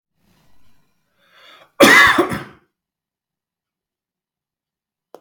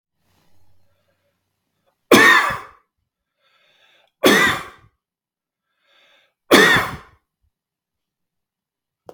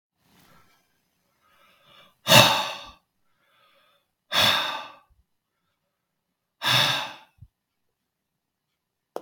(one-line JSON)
{"cough_length": "5.2 s", "cough_amplitude": 32768, "cough_signal_mean_std_ratio": 0.26, "three_cough_length": "9.1 s", "three_cough_amplitude": 32768, "three_cough_signal_mean_std_ratio": 0.28, "exhalation_length": "9.2 s", "exhalation_amplitude": 32766, "exhalation_signal_mean_std_ratio": 0.28, "survey_phase": "beta (2021-08-13 to 2022-03-07)", "age": "45-64", "gender": "Male", "wearing_mask": "No", "symptom_runny_or_blocked_nose": true, "smoker_status": "Never smoked", "respiratory_condition_asthma": false, "respiratory_condition_other": false, "recruitment_source": "REACT", "submission_delay": "1 day", "covid_test_result": "Negative", "covid_test_method": "RT-qPCR"}